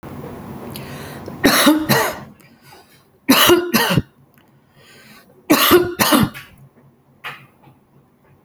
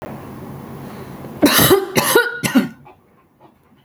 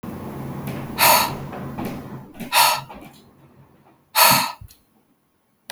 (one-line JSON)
{"three_cough_length": "8.4 s", "three_cough_amplitude": 32768, "three_cough_signal_mean_std_ratio": 0.45, "cough_length": "3.8 s", "cough_amplitude": 32768, "cough_signal_mean_std_ratio": 0.5, "exhalation_length": "5.7 s", "exhalation_amplitude": 32767, "exhalation_signal_mean_std_ratio": 0.45, "survey_phase": "alpha (2021-03-01 to 2021-08-12)", "age": "45-64", "gender": "Female", "wearing_mask": "No", "symptom_none": true, "smoker_status": "Never smoked", "respiratory_condition_asthma": false, "respiratory_condition_other": false, "recruitment_source": "REACT", "submission_delay": "1 day", "covid_test_result": "Negative", "covid_test_method": "RT-qPCR"}